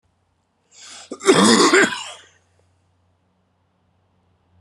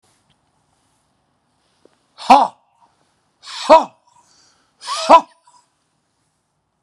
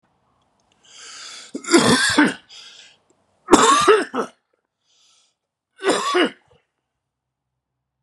{"cough_length": "4.6 s", "cough_amplitude": 30897, "cough_signal_mean_std_ratio": 0.33, "exhalation_length": "6.8 s", "exhalation_amplitude": 32768, "exhalation_signal_mean_std_ratio": 0.22, "three_cough_length": "8.0 s", "three_cough_amplitude": 32768, "three_cough_signal_mean_std_ratio": 0.38, "survey_phase": "beta (2021-08-13 to 2022-03-07)", "age": "45-64", "gender": "Male", "wearing_mask": "No", "symptom_cough_any": true, "symptom_shortness_of_breath": true, "symptom_sore_throat": true, "symptom_fatigue": true, "symptom_headache": true, "smoker_status": "Never smoked", "respiratory_condition_asthma": false, "respiratory_condition_other": false, "recruitment_source": "Test and Trace", "submission_delay": "1 day", "covid_test_result": "Positive", "covid_test_method": "ePCR"}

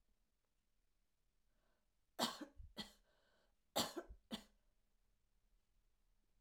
{"cough_length": "6.4 s", "cough_amplitude": 2672, "cough_signal_mean_std_ratio": 0.26, "survey_phase": "alpha (2021-03-01 to 2021-08-12)", "age": "65+", "gender": "Female", "wearing_mask": "No", "symptom_none": true, "smoker_status": "Never smoked", "respiratory_condition_asthma": false, "respiratory_condition_other": false, "recruitment_source": "REACT", "submission_delay": "2 days", "covid_test_result": "Negative", "covid_test_method": "RT-qPCR"}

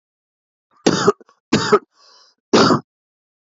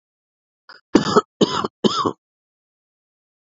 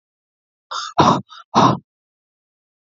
{"three_cough_length": "3.6 s", "three_cough_amplitude": 29552, "three_cough_signal_mean_std_ratio": 0.35, "cough_length": "3.6 s", "cough_amplitude": 28214, "cough_signal_mean_std_ratio": 0.3, "exhalation_length": "2.9 s", "exhalation_amplitude": 32764, "exhalation_signal_mean_std_ratio": 0.34, "survey_phase": "beta (2021-08-13 to 2022-03-07)", "age": "45-64", "gender": "Male", "wearing_mask": "No", "symptom_cough_any": true, "symptom_sore_throat": true, "smoker_status": "Current smoker (e-cigarettes or vapes only)", "respiratory_condition_asthma": false, "respiratory_condition_other": false, "recruitment_source": "Test and Trace", "submission_delay": "2 days", "covid_test_result": "Positive", "covid_test_method": "RT-qPCR", "covid_ct_value": 27.2, "covid_ct_gene": "ORF1ab gene", "covid_ct_mean": 27.7, "covid_viral_load": "830 copies/ml", "covid_viral_load_category": "Minimal viral load (< 10K copies/ml)"}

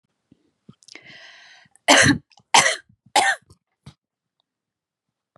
{"three_cough_length": "5.4 s", "three_cough_amplitude": 32098, "three_cough_signal_mean_std_ratio": 0.28, "survey_phase": "beta (2021-08-13 to 2022-03-07)", "age": "18-44", "gender": "Female", "wearing_mask": "No", "symptom_none": true, "smoker_status": "Never smoked", "respiratory_condition_asthma": false, "respiratory_condition_other": false, "recruitment_source": "REACT", "submission_delay": "4 days", "covid_test_result": "Negative", "covid_test_method": "RT-qPCR", "influenza_a_test_result": "Negative", "influenza_b_test_result": "Negative"}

